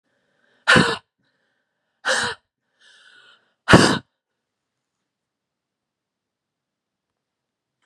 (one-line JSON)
{"exhalation_length": "7.9 s", "exhalation_amplitude": 32767, "exhalation_signal_mean_std_ratio": 0.23, "survey_phase": "beta (2021-08-13 to 2022-03-07)", "age": "18-44", "gender": "Female", "wearing_mask": "No", "symptom_none": true, "smoker_status": "Ex-smoker", "respiratory_condition_asthma": false, "respiratory_condition_other": false, "recruitment_source": "REACT", "submission_delay": "1 day", "covid_test_result": "Negative", "covid_test_method": "RT-qPCR", "influenza_a_test_result": "Negative", "influenza_b_test_result": "Negative"}